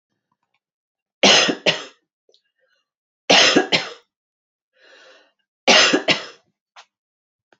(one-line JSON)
{"three_cough_length": "7.6 s", "three_cough_amplitude": 30527, "three_cough_signal_mean_std_ratio": 0.33, "survey_phase": "alpha (2021-03-01 to 2021-08-12)", "age": "65+", "gender": "Female", "wearing_mask": "No", "symptom_fatigue": true, "smoker_status": "Never smoked", "respiratory_condition_asthma": false, "respiratory_condition_other": false, "recruitment_source": "REACT", "submission_delay": "5 days", "covid_test_result": "Negative", "covid_test_method": "RT-qPCR"}